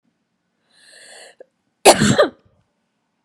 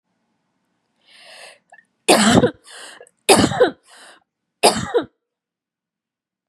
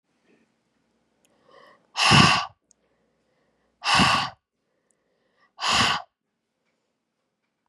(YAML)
cough_length: 3.2 s
cough_amplitude: 32768
cough_signal_mean_std_ratio: 0.26
three_cough_length: 6.5 s
three_cough_amplitude: 32768
three_cough_signal_mean_std_ratio: 0.33
exhalation_length: 7.7 s
exhalation_amplitude: 27655
exhalation_signal_mean_std_ratio: 0.32
survey_phase: beta (2021-08-13 to 2022-03-07)
age: 18-44
gender: Female
wearing_mask: 'No'
symptom_cough_any: true
symptom_runny_or_blocked_nose: true
symptom_fatigue: true
symptom_headache: true
smoker_status: Ex-smoker
respiratory_condition_asthma: false
respiratory_condition_other: false
recruitment_source: Test and Trace
submission_delay: 2 days
covid_test_result: Positive
covid_test_method: RT-qPCR
covid_ct_value: 18.7
covid_ct_gene: ORF1ab gene
covid_ct_mean: 19.7
covid_viral_load: 360000 copies/ml
covid_viral_load_category: Low viral load (10K-1M copies/ml)